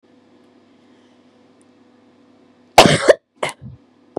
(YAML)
cough_length: 4.2 s
cough_amplitude: 32768
cough_signal_mean_std_ratio: 0.23
survey_phase: beta (2021-08-13 to 2022-03-07)
age: 45-64
gender: Female
wearing_mask: 'No'
symptom_cough_any: true
symptom_onset: 4 days
smoker_status: Current smoker (e-cigarettes or vapes only)
respiratory_condition_asthma: false
respiratory_condition_other: false
recruitment_source: Test and Trace
submission_delay: 2 days
covid_test_result: Positive
covid_test_method: RT-qPCR